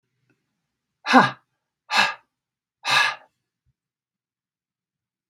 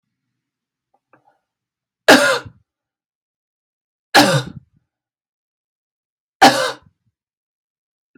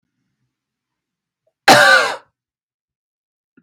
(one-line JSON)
{"exhalation_length": "5.3 s", "exhalation_amplitude": 32767, "exhalation_signal_mean_std_ratio": 0.26, "three_cough_length": "8.2 s", "three_cough_amplitude": 32768, "three_cough_signal_mean_std_ratio": 0.25, "cough_length": "3.6 s", "cough_amplitude": 32768, "cough_signal_mean_std_ratio": 0.28, "survey_phase": "beta (2021-08-13 to 2022-03-07)", "age": "45-64", "gender": "Female", "wearing_mask": "No", "symptom_runny_or_blocked_nose": true, "symptom_onset": "2 days", "smoker_status": "Never smoked", "respiratory_condition_asthma": false, "respiratory_condition_other": false, "recruitment_source": "REACT", "submission_delay": "2 days", "covid_test_result": "Negative", "covid_test_method": "RT-qPCR", "influenza_a_test_result": "Negative", "influenza_b_test_result": "Negative"}